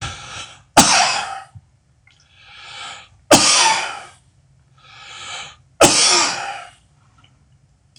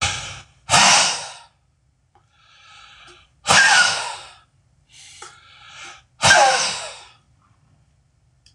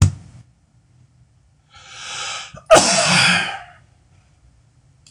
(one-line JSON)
{"three_cough_length": "8.0 s", "three_cough_amplitude": 26028, "three_cough_signal_mean_std_ratio": 0.41, "exhalation_length": "8.5 s", "exhalation_amplitude": 26028, "exhalation_signal_mean_std_ratio": 0.39, "cough_length": "5.1 s", "cough_amplitude": 26028, "cough_signal_mean_std_ratio": 0.38, "survey_phase": "beta (2021-08-13 to 2022-03-07)", "age": "45-64", "gender": "Male", "wearing_mask": "No", "symptom_abdominal_pain": true, "symptom_onset": "5 days", "smoker_status": "Never smoked", "respiratory_condition_asthma": false, "respiratory_condition_other": false, "recruitment_source": "REACT", "submission_delay": "2 days", "covid_test_result": "Negative", "covid_test_method": "RT-qPCR"}